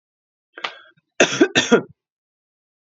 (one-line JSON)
{"cough_length": "2.8 s", "cough_amplitude": 31756, "cough_signal_mean_std_ratio": 0.31, "survey_phase": "beta (2021-08-13 to 2022-03-07)", "age": "45-64", "gender": "Female", "wearing_mask": "No", "symptom_cough_any": true, "symptom_runny_or_blocked_nose": true, "symptom_headache": true, "symptom_change_to_sense_of_smell_or_taste": true, "symptom_loss_of_taste": true, "symptom_other": true, "smoker_status": "Ex-smoker", "respiratory_condition_asthma": false, "respiratory_condition_other": false, "recruitment_source": "Test and Trace", "submission_delay": "2 days", "covid_test_result": "Positive", "covid_test_method": "RT-qPCR"}